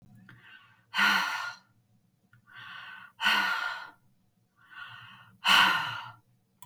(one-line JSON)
{"exhalation_length": "6.7 s", "exhalation_amplitude": 14504, "exhalation_signal_mean_std_ratio": 0.42, "survey_phase": "beta (2021-08-13 to 2022-03-07)", "age": "65+", "gender": "Female", "wearing_mask": "No", "symptom_none": true, "smoker_status": "Never smoked", "respiratory_condition_asthma": false, "respiratory_condition_other": false, "recruitment_source": "REACT", "submission_delay": "1 day", "covid_test_result": "Negative", "covid_test_method": "RT-qPCR", "influenza_a_test_result": "Negative", "influenza_b_test_result": "Negative"}